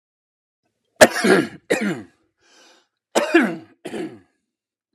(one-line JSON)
{"cough_length": "4.9 s", "cough_amplitude": 32768, "cough_signal_mean_std_ratio": 0.34, "survey_phase": "alpha (2021-03-01 to 2021-08-12)", "age": "45-64", "gender": "Male", "wearing_mask": "No", "symptom_none": true, "smoker_status": "Never smoked", "respiratory_condition_asthma": true, "respiratory_condition_other": false, "recruitment_source": "REACT", "submission_delay": "3 days", "covid_test_result": "Negative", "covid_test_method": "RT-qPCR"}